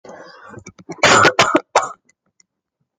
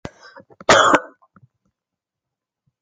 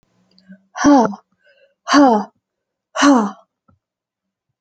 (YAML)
three_cough_length: 3.0 s
three_cough_amplitude: 30551
three_cough_signal_mean_std_ratio: 0.39
cough_length: 2.8 s
cough_amplitude: 30492
cough_signal_mean_std_ratio: 0.28
exhalation_length: 4.6 s
exhalation_amplitude: 29458
exhalation_signal_mean_std_ratio: 0.38
survey_phase: alpha (2021-03-01 to 2021-08-12)
age: 18-44
gender: Female
wearing_mask: 'No'
symptom_cough_any: true
symptom_fatigue: true
symptom_fever_high_temperature: true
symptom_headache: true
symptom_onset: 3 days
smoker_status: Never smoked
respiratory_condition_asthma: false
respiratory_condition_other: false
recruitment_source: Test and Trace
submission_delay: 1 day
covid_test_result: Positive
covid_test_method: RT-qPCR
covid_ct_value: 16.9
covid_ct_gene: N gene
covid_ct_mean: 18.0
covid_viral_load: 1300000 copies/ml
covid_viral_load_category: High viral load (>1M copies/ml)